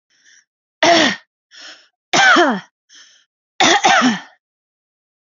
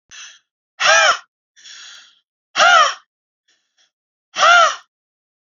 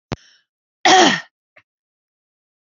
three_cough_length: 5.4 s
three_cough_amplitude: 31893
three_cough_signal_mean_std_ratio: 0.42
exhalation_length: 5.6 s
exhalation_amplitude: 31109
exhalation_signal_mean_std_ratio: 0.37
cough_length: 2.6 s
cough_amplitude: 30147
cough_signal_mean_std_ratio: 0.3
survey_phase: beta (2021-08-13 to 2022-03-07)
age: 18-44
gender: Female
wearing_mask: 'No'
symptom_none: true
smoker_status: Ex-smoker
respiratory_condition_asthma: false
respiratory_condition_other: false
recruitment_source: Test and Trace
submission_delay: 1 day
covid_test_result: Positive
covid_test_method: LAMP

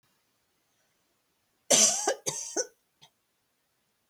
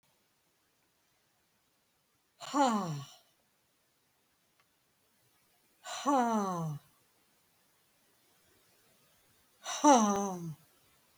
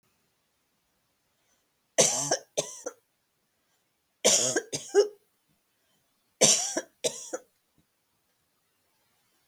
cough_length: 4.1 s
cough_amplitude: 16497
cough_signal_mean_std_ratio: 0.29
exhalation_length: 11.2 s
exhalation_amplitude: 9570
exhalation_signal_mean_std_ratio: 0.32
three_cough_length: 9.5 s
three_cough_amplitude: 19953
three_cough_signal_mean_std_ratio: 0.3
survey_phase: beta (2021-08-13 to 2022-03-07)
age: 65+
gender: Female
wearing_mask: 'No'
symptom_none: true
smoker_status: Never smoked
respiratory_condition_asthma: false
respiratory_condition_other: false
recruitment_source: REACT
submission_delay: 1 day
covid_test_result: Negative
covid_test_method: RT-qPCR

